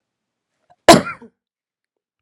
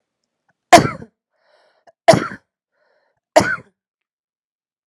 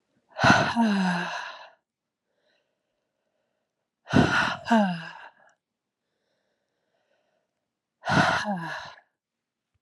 {
  "cough_length": "2.2 s",
  "cough_amplitude": 32768,
  "cough_signal_mean_std_ratio": 0.2,
  "three_cough_length": "4.9 s",
  "three_cough_amplitude": 32768,
  "three_cough_signal_mean_std_ratio": 0.22,
  "exhalation_length": "9.8 s",
  "exhalation_amplitude": 18230,
  "exhalation_signal_mean_std_ratio": 0.4,
  "survey_phase": "beta (2021-08-13 to 2022-03-07)",
  "age": "45-64",
  "gender": "Female",
  "wearing_mask": "No",
  "symptom_none": true,
  "smoker_status": "Ex-smoker",
  "respiratory_condition_asthma": false,
  "respiratory_condition_other": false,
  "recruitment_source": "REACT",
  "submission_delay": "1 day",
  "covid_test_result": "Negative",
  "covid_test_method": "RT-qPCR",
  "influenza_a_test_result": "Unknown/Void",
  "influenza_b_test_result": "Unknown/Void"
}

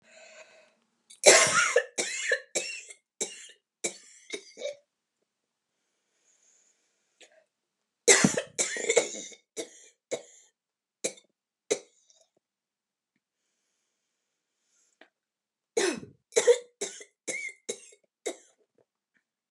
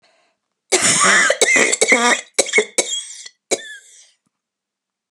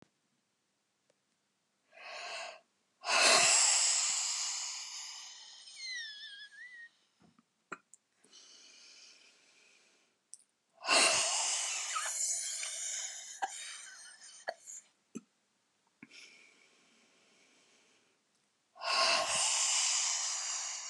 {
  "three_cough_length": "19.5 s",
  "three_cough_amplitude": 29870,
  "three_cough_signal_mean_std_ratio": 0.27,
  "cough_length": "5.1 s",
  "cough_amplitude": 32701,
  "cough_signal_mean_std_ratio": 0.51,
  "exhalation_length": "20.9 s",
  "exhalation_amplitude": 8468,
  "exhalation_signal_mean_std_ratio": 0.47,
  "survey_phase": "beta (2021-08-13 to 2022-03-07)",
  "age": "65+",
  "gender": "Female",
  "wearing_mask": "No",
  "symptom_none": true,
  "smoker_status": "Never smoked",
  "respiratory_condition_asthma": false,
  "respiratory_condition_other": false,
  "recruitment_source": "REACT",
  "submission_delay": "1 day",
  "covid_test_result": "Negative",
  "covid_test_method": "RT-qPCR",
  "influenza_a_test_result": "Negative",
  "influenza_b_test_result": "Negative"
}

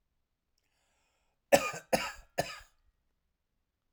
{
  "three_cough_length": "3.9 s",
  "three_cough_amplitude": 13222,
  "three_cough_signal_mean_std_ratio": 0.22,
  "survey_phase": "alpha (2021-03-01 to 2021-08-12)",
  "age": "65+",
  "gender": "Male",
  "wearing_mask": "No",
  "symptom_none": true,
  "smoker_status": "Ex-smoker",
  "respiratory_condition_asthma": false,
  "respiratory_condition_other": false,
  "recruitment_source": "REACT",
  "submission_delay": "6 days",
  "covid_test_result": "Negative",
  "covid_test_method": "RT-qPCR"
}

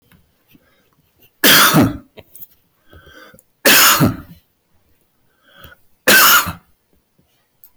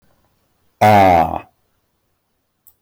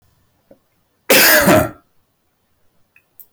{
  "three_cough_length": "7.8 s",
  "three_cough_amplitude": 28631,
  "three_cough_signal_mean_std_ratio": 0.39,
  "exhalation_length": "2.8 s",
  "exhalation_amplitude": 27141,
  "exhalation_signal_mean_std_ratio": 0.37,
  "cough_length": "3.3 s",
  "cough_amplitude": 27942,
  "cough_signal_mean_std_ratio": 0.37,
  "survey_phase": "beta (2021-08-13 to 2022-03-07)",
  "age": "65+",
  "gender": "Male",
  "wearing_mask": "No",
  "symptom_none": true,
  "smoker_status": "Never smoked",
  "respiratory_condition_asthma": false,
  "respiratory_condition_other": false,
  "recruitment_source": "REACT",
  "submission_delay": "2 days",
  "covid_test_result": "Negative",
  "covid_test_method": "RT-qPCR",
  "influenza_a_test_result": "Negative",
  "influenza_b_test_result": "Negative"
}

